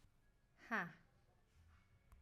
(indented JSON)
{
  "exhalation_length": "2.2 s",
  "exhalation_amplitude": 1163,
  "exhalation_signal_mean_std_ratio": 0.32,
  "survey_phase": "alpha (2021-03-01 to 2021-08-12)",
  "age": "18-44",
  "gender": "Female",
  "wearing_mask": "No",
  "symptom_none": true,
  "smoker_status": "Never smoked",
  "respiratory_condition_asthma": false,
  "respiratory_condition_other": false,
  "recruitment_source": "REACT",
  "submission_delay": "2 days",
  "covid_test_result": "Negative",
  "covid_test_method": "RT-qPCR"
}